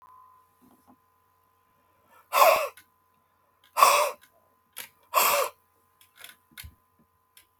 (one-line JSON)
{"exhalation_length": "7.6 s", "exhalation_amplitude": 26543, "exhalation_signal_mean_std_ratio": 0.29, "survey_phase": "alpha (2021-03-01 to 2021-08-12)", "age": "65+", "gender": "Male", "wearing_mask": "No", "symptom_none": true, "smoker_status": "Never smoked", "respiratory_condition_asthma": false, "respiratory_condition_other": false, "recruitment_source": "REACT", "submission_delay": "2 days", "covid_test_result": "Negative", "covid_test_method": "RT-qPCR"}